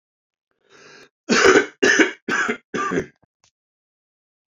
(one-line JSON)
{"three_cough_length": "4.5 s", "three_cough_amplitude": 27676, "three_cough_signal_mean_std_ratio": 0.39, "survey_phase": "alpha (2021-03-01 to 2021-08-12)", "age": "18-44", "gender": "Male", "wearing_mask": "No", "symptom_cough_any": true, "symptom_shortness_of_breath": true, "symptom_fatigue": true, "symptom_change_to_sense_of_smell_or_taste": true, "symptom_loss_of_taste": true, "symptom_onset": "5 days", "smoker_status": "Ex-smoker", "respiratory_condition_asthma": false, "respiratory_condition_other": false, "recruitment_source": "Test and Trace", "submission_delay": "2 days", "covid_test_result": "Positive", "covid_test_method": "RT-qPCR", "covid_ct_value": 16.0, "covid_ct_gene": "N gene", "covid_ct_mean": 16.1, "covid_viral_load": "5300000 copies/ml", "covid_viral_load_category": "High viral load (>1M copies/ml)"}